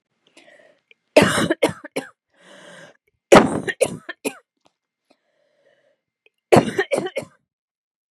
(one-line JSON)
{"three_cough_length": "8.1 s", "three_cough_amplitude": 32768, "three_cough_signal_mean_std_ratio": 0.28, "survey_phase": "beta (2021-08-13 to 2022-03-07)", "age": "45-64", "gender": "Female", "wearing_mask": "No", "symptom_cough_any": true, "symptom_shortness_of_breath": true, "symptom_sore_throat": true, "symptom_fatigue": true, "symptom_change_to_sense_of_smell_or_taste": true, "smoker_status": "Ex-smoker", "respiratory_condition_asthma": false, "respiratory_condition_other": false, "recruitment_source": "Test and Trace", "submission_delay": "1 day", "covid_test_result": "Positive", "covid_test_method": "LFT"}